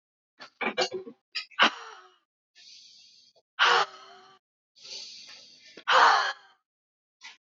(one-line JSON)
{"exhalation_length": "7.4 s", "exhalation_amplitude": 15569, "exhalation_signal_mean_std_ratio": 0.33, "survey_phase": "beta (2021-08-13 to 2022-03-07)", "age": "18-44", "gender": "Female", "wearing_mask": "No", "symptom_none": true, "smoker_status": "Ex-smoker", "respiratory_condition_asthma": false, "respiratory_condition_other": false, "recruitment_source": "Test and Trace", "submission_delay": "2 days", "covid_test_result": "Positive", "covid_test_method": "LFT"}